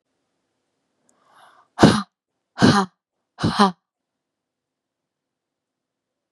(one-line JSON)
{"exhalation_length": "6.3 s", "exhalation_amplitude": 32766, "exhalation_signal_mean_std_ratio": 0.25, "survey_phase": "beta (2021-08-13 to 2022-03-07)", "age": "18-44", "gender": "Female", "wearing_mask": "No", "symptom_cough_any": true, "symptom_runny_or_blocked_nose": true, "symptom_sore_throat": true, "symptom_abdominal_pain": true, "symptom_diarrhoea": true, "symptom_fatigue": true, "smoker_status": "Never smoked", "respiratory_condition_asthma": false, "respiratory_condition_other": false, "recruitment_source": "REACT", "submission_delay": "2 days", "covid_test_result": "Negative", "covid_test_method": "RT-qPCR", "influenza_a_test_result": "Negative", "influenza_b_test_result": "Negative"}